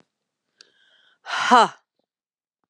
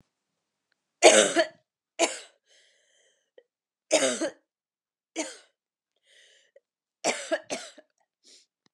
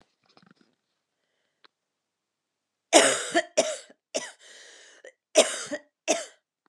{"exhalation_length": "2.7 s", "exhalation_amplitude": 29153, "exhalation_signal_mean_std_ratio": 0.25, "three_cough_length": "8.7 s", "three_cough_amplitude": 27815, "three_cough_signal_mean_std_ratio": 0.26, "cough_length": "6.7 s", "cough_amplitude": 25342, "cough_signal_mean_std_ratio": 0.28, "survey_phase": "beta (2021-08-13 to 2022-03-07)", "age": "45-64", "gender": "Female", "wearing_mask": "Yes", "symptom_cough_any": true, "symptom_runny_or_blocked_nose": true, "symptom_shortness_of_breath": true, "symptom_sore_throat": true, "symptom_fatigue": true, "symptom_onset": "3 days", "smoker_status": "Ex-smoker", "respiratory_condition_asthma": false, "respiratory_condition_other": false, "recruitment_source": "Test and Trace", "submission_delay": "2 days", "covid_test_result": "Positive", "covid_test_method": "RT-qPCR", "covid_ct_value": 17.9, "covid_ct_gene": "ORF1ab gene", "covid_ct_mean": 18.0, "covid_viral_load": "1200000 copies/ml", "covid_viral_load_category": "High viral load (>1M copies/ml)"}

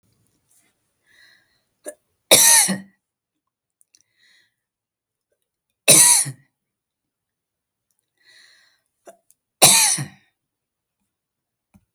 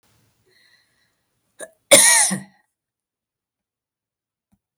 {"three_cough_length": "11.9 s", "three_cough_amplitude": 32768, "three_cough_signal_mean_std_ratio": 0.25, "cough_length": "4.8 s", "cough_amplitude": 32768, "cough_signal_mean_std_ratio": 0.24, "survey_phase": "beta (2021-08-13 to 2022-03-07)", "age": "65+", "gender": "Female", "wearing_mask": "No", "symptom_none": true, "smoker_status": "Never smoked", "respiratory_condition_asthma": false, "respiratory_condition_other": false, "recruitment_source": "REACT", "submission_delay": "4 days", "covid_test_result": "Negative", "covid_test_method": "RT-qPCR", "influenza_a_test_result": "Unknown/Void", "influenza_b_test_result": "Unknown/Void"}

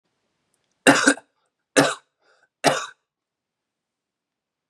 {"three_cough_length": "4.7 s", "three_cough_amplitude": 30371, "three_cough_signal_mean_std_ratio": 0.26, "survey_phase": "beta (2021-08-13 to 2022-03-07)", "age": "18-44", "gender": "Male", "wearing_mask": "No", "symptom_sore_throat": true, "symptom_onset": "5 days", "smoker_status": "Never smoked", "respiratory_condition_asthma": false, "respiratory_condition_other": false, "recruitment_source": "Test and Trace", "submission_delay": "1 day", "covid_test_result": "Positive", "covid_test_method": "RT-qPCR", "covid_ct_value": 19.9, "covid_ct_gene": "N gene", "covid_ct_mean": 20.2, "covid_viral_load": "240000 copies/ml", "covid_viral_load_category": "Low viral load (10K-1M copies/ml)"}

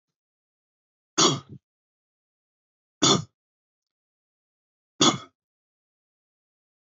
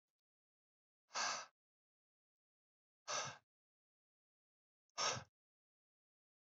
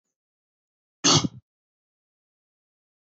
{"three_cough_length": "6.9 s", "three_cough_amplitude": 16394, "three_cough_signal_mean_std_ratio": 0.21, "exhalation_length": "6.6 s", "exhalation_amplitude": 1458, "exhalation_signal_mean_std_ratio": 0.27, "cough_length": "3.1 s", "cough_amplitude": 16774, "cough_signal_mean_std_ratio": 0.21, "survey_phase": "beta (2021-08-13 to 2022-03-07)", "age": "18-44", "gender": "Male", "wearing_mask": "No", "symptom_cough_any": true, "symptom_runny_or_blocked_nose": true, "symptom_sore_throat": true, "symptom_fatigue": true, "symptom_headache": true, "symptom_onset": "3 days", "smoker_status": "Never smoked", "respiratory_condition_asthma": false, "respiratory_condition_other": false, "recruitment_source": "Test and Trace", "submission_delay": "1 day", "covid_test_result": "Positive", "covid_test_method": "RT-qPCR", "covid_ct_value": 21.0, "covid_ct_gene": "N gene"}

